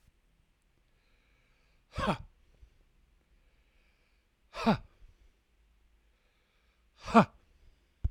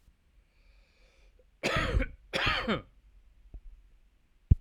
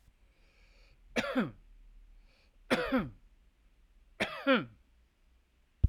{
  "exhalation_length": "8.1 s",
  "exhalation_amplitude": 14220,
  "exhalation_signal_mean_std_ratio": 0.19,
  "cough_length": "4.6 s",
  "cough_amplitude": 14672,
  "cough_signal_mean_std_ratio": 0.35,
  "three_cough_length": "5.9 s",
  "three_cough_amplitude": 8140,
  "three_cough_signal_mean_std_ratio": 0.33,
  "survey_phase": "alpha (2021-03-01 to 2021-08-12)",
  "age": "65+",
  "gender": "Male",
  "wearing_mask": "No",
  "symptom_none": true,
  "smoker_status": "Never smoked",
  "respiratory_condition_asthma": true,
  "respiratory_condition_other": false,
  "recruitment_source": "REACT",
  "submission_delay": "2 days",
  "covid_test_result": "Negative",
  "covid_test_method": "RT-qPCR"
}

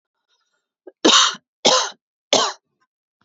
{
  "three_cough_length": "3.2 s",
  "three_cough_amplitude": 30626,
  "three_cough_signal_mean_std_ratio": 0.36,
  "survey_phase": "beta (2021-08-13 to 2022-03-07)",
  "age": "18-44",
  "gender": "Female",
  "wearing_mask": "No",
  "symptom_none": true,
  "smoker_status": "Ex-smoker",
  "respiratory_condition_asthma": false,
  "respiratory_condition_other": false,
  "recruitment_source": "REACT",
  "submission_delay": "2 days",
  "covid_test_result": "Negative",
  "covid_test_method": "RT-qPCR",
  "covid_ct_value": 38.5,
  "covid_ct_gene": "N gene",
  "influenza_a_test_result": "Negative",
  "influenza_b_test_result": "Negative"
}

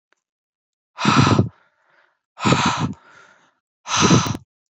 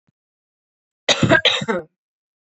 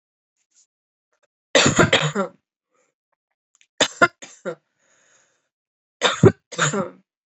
{
  "exhalation_length": "4.7 s",
  "exhalation_amplitude": 27918,
  "exhalation_signal_mean_std_ratio": 0.44,
  "cough_length": "2.6 s",
  "cough_amplitude": 28017,
  "cough_signal_mean_std_ratio": 0.36,
  "three_cough_length": "7.3 s",
  "three_cough_amplitude": 27312,
  "three_cough_signal_mean_std_ratio": 0.3,
  "survey_phase": "beta (2021-08-13 to 2022-03-07)",
  "age": "18-44",
  "gender": "Female",
  "wearing_mask": "No",
  "symptom_cough_any": true,
  "symptom_runny_or_blocked_nose": true,
  "symptom_shortness_of_breath": true,
  "symptom_fatigue": true,
  "symptom_fever_high_temperature": true,
  "symptom_headache": true,
  "symptom_change_to_sense_of_smell_or_taste": true,
  "symptom_loss_of_taste": true,
  "symptom_onset": "5 days",
  "smoker_status": "Current smoker (1 to 10 cigarettes per day)",
  "respiratory_condition_asthma": false,
  "respiratory_condition_other": false,
  "recruitment_source": "Test and Trace",
  "submission_delay": "2 days",
  "covid_test_result": "Positive",
  "covid_test_method": "RT-qPCR",
  "covid_ct_value": 15.2,
  "covid_ct_gene": "N gene"
}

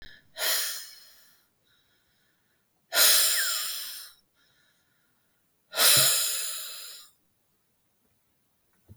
{
  "exhalation_length": "9.0 s",
  "exhalation_amplitude": 14683,
  "exhalation_signal_mean_std_ratio": 0.39,
  "survey_phase": "beta (2021-08-13 to 2022-03-07)",
  "age": "65+",
  "gender": "Female",
  "wearing_mask": "No",
  "symptom_none": true,
  "smoker_status": "Never smoked",
  "respiratory_condition_asthma": false,
  "respiratory_condition_other": false,
  "recruitment_source": "REACT",
  "submission_delay": "8 days",
  "covid_test_result": "Negative",
  "covid_test_method": "RT-qPCR",
  "influenza_a_test_result": "Negative",
  "influenza_b_test_result": "Negative"
}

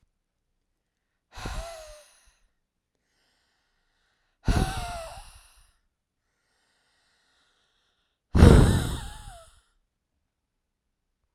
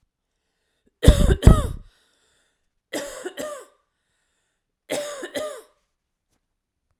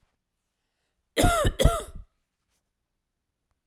{
  "exhalation_length": "11.3 s",
  "exhalation_amplitude": 26560,
  "exhalation_signal_mean_std_ratio": 0.22,
  "three_cough_length": "7.0 s",
  "three_cough_amplitude": 32768,
  "three_cough_signal_mean_std_ratio": 0.25,
  "cough_length": "3.7 s",
  "cough_amplitude": 20058,
  "cough_signal_mean_std_ratio": 0.31,
  "survey_phase": "alpha (2021-03-01 to 2021-08-12)",
  "age": "45-64",
  "gender": "Female",
  "wearing_mask": "No",
  "symptom_diarrhoea": true,
  "smoker_status": "Ex-smoker",
  "respiratory_condition_asthma": false,
  "respiratory_condition_other": false,
  "recruitment_source": "REACT",
  "submission_delay": "1 day",
  "covid_test_result": "Negative",
  "covid_test_method": "RT-qPCR"
}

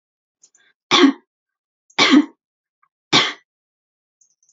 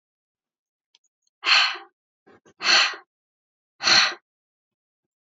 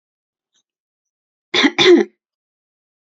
{
  "three_cough_length": "4.5 s",
  "three_cough_amplitude": 32266,
  "three_cough_signal_mean_std_ratio": 0.3,
  "exhalation_length": "5.3 s",
  "exhalation_amplitude": 24027,
  "exhalation_signal_mean_std_ratio": 0.32,
  "cough_length": "3.1 s",
  "cough_amplitude": 30955,
  "cough_signal_mean_std_ratio": 0.3,
  "survey_phase": "beta (2021-08-13 to 2022-03-07)",
  "age": "18-44",
  "gender": "Female",
  "wearing_mask": "No",
  "symptom_none": true,
  "smoker_status": "Never smoked",
  "respiratory_condition_asthma": false,
  "respiratory_condition_other": false,
  "recruitment_source": "Test and Trace",
  "submission_delay": "2 days",
  "covid_test_result": "Positive",
  "covid_test_method": "LFT"
}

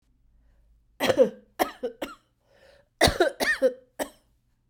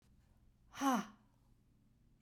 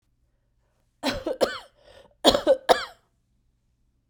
{
  "cough_length": "4.7 s",
  "cough_amplitude": 17629,
  "cough_signal_mean_std_ratio": 0.36,
  "exhalation_length": "2.2 s",
  "exhalation_amplitude": 3046,
  "exhalation_signal_mean_std_ratio": 0.3,
  "three_cough_length": "4.1 s",
  "three_cough_amplitude": 29069,
  "three_cough_signal_mean_std_ratio": 0.3,
  "survey_phase": "beta (2021-08-13 to 2022-03-07)",
  "age": "45-64",
  "gender": "Female",
  "wearing_mask": "No",
  "symptom_cough_any": true,
  "symptom_runny_or_blocked_nose": true,
  "symptom_fatigue": true,
  "symptom_headache": true,
  "smoker_status": "Ex-smoker",
  "respiratory_condition_asthma": true,
  "respiratory_condition_other": false,
  "recruitment_source": "REACT",
  "submission_delay": "1 day",
  "covid_test_result": "Negative",
  "covid_test_method": "RT-qPCR"
}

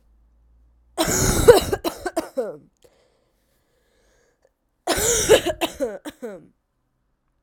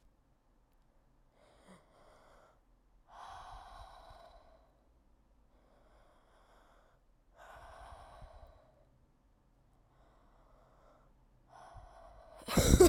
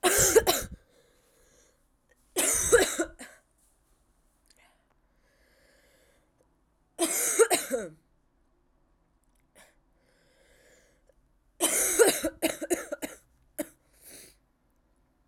{
  "cough_length": "7.4 s",
  "cough_amplitude": 32768,
  "cough_signal_mean_std_ratio": 0.36,
  "exhalation_length": "12.9 s",
  "exhalation_amplitude": 11241,
  "exhalation_signal_mean_std_ratio": 0.18,
  "three_cough_length": "15.3 s",
  "three_cough_amplitude": 14643,
  "three_cough_signal_mean_std_ratio": 0.34,
  "survey_phase": "alpha (2021-03-01 to 2021-08-12)",
  "age": "18-44",
  "gender": "Female",
  "wearing_mask": "No",
  "symptom_cough_any": true,
  "symptom_new_continuous_cough": true,
  "symptom_shortness_of_breath": true,
  "symptom_abdominal_pain": true,
  "symptom_diarrhoea": true,
  "symptom_fatigue": true,
  "symptom_fever_high_temperature": true,
  "symptom_headache": true,
  "symptom_change_to_sense_of_smell_or_taste": true,
  "smoker_status": "Ex-smoker",
  "respiratory_condition_asthma": false,
  "respiratory_condition_other": false,
  "recruitment_source": "Test and Trace",
  "submission_delay": "2 days",
  "covid_test_result": "Positive",
  "covid_test_method": "RT-qPCR",
  "covid_ct_value": 12.4,
  "covid_ct_gene": "ORF1ab gene",
  "covid_ct_mean": 13.1,
  "covid_viral_load": "52000000 copies/ml",
  "covid_viral_load_category": "High viral load (>1M copies/ml)"
}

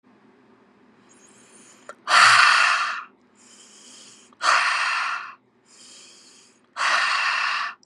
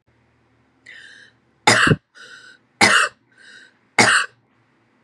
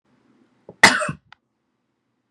{
  "exhalation_length": "7.9 s",
  "exhalation_amplitude": 26968,
  "exhalation_signal_mean_std_ratio": 0.47,
  "three_cough_length": "5.0 s",
  "three_cough_amplitude": 32766,
  "three_cough_signal_mean_std_ratio": 0.34,
  "cough_length": "2.3 s",
  "cough_amplitude": 32768,
  "cough_signal_mean_std_ratio": 0.21,
  "survey_phase": "beta (2021-08-13 to 2022-03-07)",
  "age": "18-44",
  "gender": "Female",
  "wearing_mask": "No",
  "symptom_headache": true,
  "smoker_status": "Ex-smoker",
  "respiratory_condition_asthma": false,
  "respiratory_condition_other": false,
  "recruitment_source": "REACT",
  "submission_delay": "2 days",
  "covid_test_result": "Negative",
  "covid_test_method": "RT-qPCR",
  "influenza_a_test_result": "Negative",
  "influenza_b_test_result": "Negative"
}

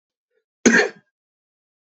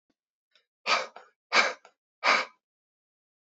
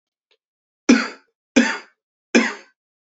{
  "cough_length": "1.9 s",
  "cough_amplitude": 28673,
  "cough_signal_mean_std_ratio": 0.27,
  "exhalation_length": "3.4 s",
  "exhalation_amplitude": 13660,
  "exhalation_signal_mean_std_ratio": 0.32,
  "three_cough_length": "3.2 s",
  "three_cough_amplitude": 32767,
  "three_cough_signal_mean_std_ratio": 0.3,
  "survey_phase": "beta (2021-08-13 to 2022-03-07)",
  "age": "18-44",
  "gender": "Male",
  "wearing_mask": "No",
  "symptom_runny_or_blocked_nose": true,
  "symptom_headache": true,
  "symptom_onset": "12 days",
  "smoker_status": "Ex-smoker",
  "respiratory_condition_asthma": false,
  "respiratory_condition_other": false,
  "recruitment_source": "REACT",
  "submission_delay": "1 day",
  "covid_test_result": "Negative",
  "covid_test_method": "RT-qPCR"
}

